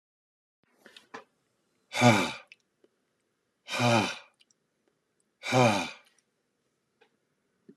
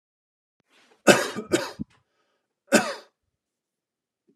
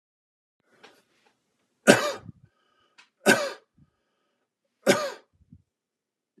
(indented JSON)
{
  "exhalation_length": "7.8 s",
  "exhalation_amplitude": 13926,
  "exhalation_signal_mean_std_ratio": 0.3,
  "cough_length": "4.4 s",
  "cough_amplitude": 28808,
  "cough_signal_mean_std_ratio": 0.25,
  "three_cough_length": "6.4 s",
  "three_cough_amplitude": 32206,
  "three_cough_signal_mean_std_ratio": 0.23,
  "survey_phase": "alpha (2021-03-01 to 2021-08-12)",
  "age": "45-64",
  "gender": "Male",
  "wearing_mask": "No",
  "symptom_none": true,
  "smoker_status": "Ex-smoker",
  "respiratory_condition_asthma": false,
  "respiratory_condition_other": false,
  "recruitment_source": "REACT",
  "submission_delay": "1 day",
  "covid_test_result": "Negative",
  "covid_test_method": "RT-qPCR"
}